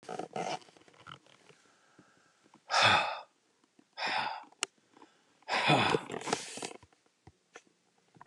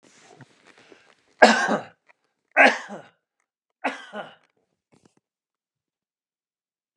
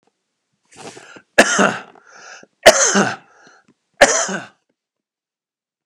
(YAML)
exhalation_length: 8.3 s
exhalation_amplitude: 9458
exhalation_signal_mean_std_ratio: 0.38
three_cough_length: 7.0 s
three_cough_amplitude: 32740
three_cough_signal_mean_std_ratio: 0.23
cough_length: 5.9 s
cough_amplitude: 32768
cough_signal_mean_std_ratio: 0.32
survey_phase: beta (2021-08-13 to 2022-03-07)
age: 45-64
gender: Male
wearing_mask: 'No'
symptom_cough_any: true
symptom_onset: 13 days
smoker_status: Never smoked
respiratory_condition_asthma: true
respiratory_condition_other: false
recruitment_source: REACT
submission_delay: 1 day
covid_test_result: Negative
covid_test_method: RT-qPCR
influenza_a_test_result: Negative
influenza_b_test_result: Negative